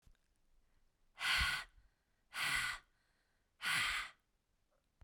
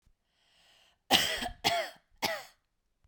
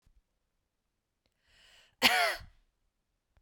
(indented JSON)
{
  "exhalation_length": "5.0 s",
  "exhalation_amplitude": 2526,
  "exhalation_signal_mean_std_ratio": 0.44,
  "three_cough_length": "3.1 s",
  "three_cough_amplitude": 15167,
  "three_cough_signal_mean_std_ratio": 0.38,
  "cough_length": "3.4 s",
  "cough_amplitude": 16117,
  "cough_signal_mean_std_ratio": 0.25,
  "survey_phase": "beta (2021-08-13 to 2022-03-07)",
  "age": "18-44",
  "gender": "Female",
  "wearing_mask": "No",
  "symptom_runny_or_blocked_nose": true,
  "smoker_status": "Ex-smoker",
  "respiratory_condition_asthma": false,
  "respiratory_condition_other": false,
  "recruitment_source": "REACT",
  "submission_delay": "3 days",
  "covid_test_result": "Negative",
  "covid_test_method": "RT-qPCR"
}